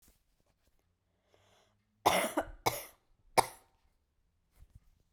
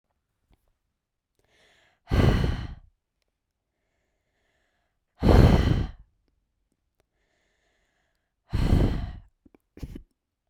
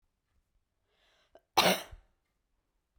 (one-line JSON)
{"three_cough_length": "5.1 s", "three_cough_amplitude": 11625, "three_cough_signal_mean_std_ratio": 0.24, "exhalation_length": "10.5 s", "exhalation_amplitude": 20591, "exhalation_signal_mean_std_ratio": 0.31, "cough_length": "3.0 s", "cough_amplitude": 9893, "cough_signal_mean_std_ratio": 0.22, "survey_phase": "beta (2021-08-13 to 2022-03-07)", "age": "18-44", "gender": "Female", "wearing_mask": "No", "symptom_cough_any": true, "symptom_new_continuous_cough": true, "symptom_runny_or_blocked_nose": true, "symptom_shortness_of_breath": true, "symptom_fatigue": true, "symptom_change_to_sense_of_smell_or_taste": true, "smoker_status": "Never smoked", "respiratory_condition_asthma": false, "respiratory_condition_other": false, "recruitment_source": "Test and Trace", "submission_delay": "3 days", "covid_test_result": "Positive", "covid_test_method": "RT-qPCR", "covid_ct_value": 33.3, "covid_ct_gene": "ORF1ab gene", "covid_ct_mean": 34.6, "covid_viral_load": "4.3 copies/ml", "covid_viral_load_category": "Minimal viral load (< 10K copies/ml)"}